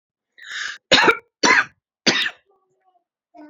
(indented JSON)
{
  "three_cough_length": "3.5 s",
  "three_cough_amplitude": 31346,
  "three_cough_signal_mean_std_ratio": 0.37,
  "survey_phase": "beta (2021-08-13 to 2022-03-07)",
  "age": "18-44",
  "gender": "Female",
  "wearing_mask": "No",
  "symptom_none": true,
  "smoker_status": "Never smoked",
  "respiratory_condition_asthma": true,
  "respiratory_condition_other": false,
  "recruitment_source": "REACT",
  "submission_delay": "1 day",
  "covid_test_result": "Negative",
  "covid_test_method": "RT-qPCR",
  "influenza_a_test_result": "Unknown/Void",
  "influenza_b_test_result": "Unknown/Void"
}